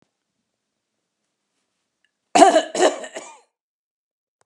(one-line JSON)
{"cough_length": "4.5 s", "cough_amplitude": 32768, "cough_signal_mean_std_ratio": 0.25, "survey_phase": "beta (2021-08-13 to 2022-03-07)", "age": "65+", "gender": "Female", "wearing_mask": "No", "symptom_none": true, "smoker_status": "Never smoked", "respiratory_condition_asthma": false, "respiratory_condition_other": false, "recruitment_source": "REACT", "submission_delay": "2 days", "covid_test_result": "Negative", "covid_test_method": "RT-qPCR"}